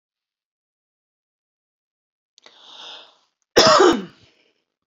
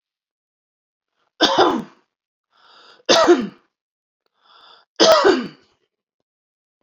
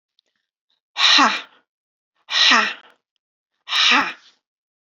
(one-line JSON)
{"cough_length": "4.9 s", "cough_amplitude": 30598, "cough_signal_mean_std_ratio": 0.25, "three_cough_length": "6.8 s", "three_cough_amplitude": 32118, "three_cough_signal_mean_std_ratio": 0.33, "exhalation_length": "4.9 s", "exhalation_amplitude": 27889, "exhalation_signal_mean_std_ratio": 0.4, "survey_phase": "beta (2021-08-13 to 2022-03-07)", "age": "45-64", "gender": "Female", "wearing_mask": "No", "symptom_none": true, "smoker_status": "Never smoked", "respiratory_condition_asthma": true, "respiratory_condition_other": false, "recruitment_source": "Test and Trace", "submission_delay": "3 days", "covid_test_result": "Negative", "covid_test_method": "RT-qPCR"}